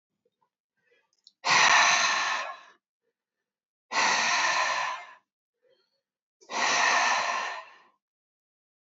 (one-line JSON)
{"exhalation_length": "8.9 s", "exhalation_amplitude": 12106, "exhalation_signal_mean_std_ratio": 0.5, "survey_phase": "alpha (2021-03-01 to 2021-08-12)", "age": "65+", "gender": "Female", "wearing_mask": "No", "symptom_fatigue": true, "smoker_status": "Never smoked", "respiratory_condition_asthma": false, "respiratory_condition_other": false, "recruitment_source": "REACT", "submission_delay": "5 days", "covid_test_result": "Negative", "covid_test_method": "RT-qPCR"}